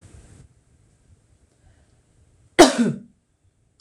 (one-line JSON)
{"cough_length": "3.8 s", "cough_amplitude": 26028, "cough_signal_mean_std_ratio": 0.21, "survey_phase": "beta (2021-08-13 to 2022-03-07)", "age": "45-64", "gender": "Female", "wearing_mask": "No", "symptom_none": true, "smoker_status": "Never smoked", "respiratory_condition_asthma": false, "respiratory_condition_other": false, "recruitment_source": "REACT", "submission_delay": "0 days", "covid_test_result": "Negative", "covid_test_method": "RT-qPCR"}